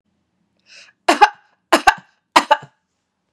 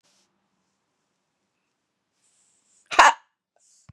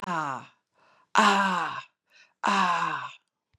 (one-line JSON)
{"three_cough_length": "3.3 s", "three_cough_amplitude": 32768, "three_cough_signal_mean_std_ratio": 0.26, "cough_length": "3.9 s", "cough_amplitude": 32767, "cough_signal_mean_std_ratio": 0.15, "exhalation_length": "3.6 s", "exhalation_amplitude": 20616, "exhalation_signal_mean_std_ratio": 0.53, "survey_phase": "beta (2021-08-13 to 2022-03-07)", "age": "45-64", "gender": "Female", "wearing_mask": "No", "symptom_none": true, "smoker_status": "Never smoked", "respiratory_condition_asthma": false, "respiratory_condition_other": false, "recruitment_source": "REACT", "submission_delay": "1 day", "covid_test_result": "Negative", "covid_test_method": "RT-qPCR", "influenza_a_test_result": "Negative", "influenza_b_test_result": "Negative"}